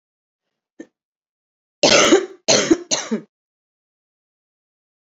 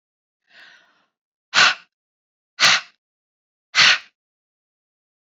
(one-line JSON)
{"cough_length": "5.1 s", "cough_amplitude": 32768, "cough_signal_mean_std_ratio": 0.32, "exhalation_length": "5.4 s", "exhalation_amplitude": 30024, "exhalation_signal_mean_std_ratio": 0.27, "survey_phase": "beta (2021-08-13 to 2022-03-07)", "age": "18-44", "gender": "Female", "wearing_mask": "No", "symptom_cough_any": true, "symptom_runny_or_blocked_nose": true, "symptom_fever_high_temperature": true, "symptom_change_to_sense_of_smell_or_taste": true, "symptom_onset": "3 days", "smoker_status": "Never smoked", "respiratory_condition_asthma": false, "respiratory_condition_other": false, "recruitment_source": "Test and Trace", "submission_delay": "2 days", "covid_test_result": "Positive", "covid_test_method": "RT-qPCR", "covid_ct_value": 16.5, "covid_ct_gene": "ORF1ab gene", "covid_ct_mean": 17.4, "covid_viral_load": "2000000 copies/ml", "covid_viral_load_category": "High viral load (>1M copies/ml)"}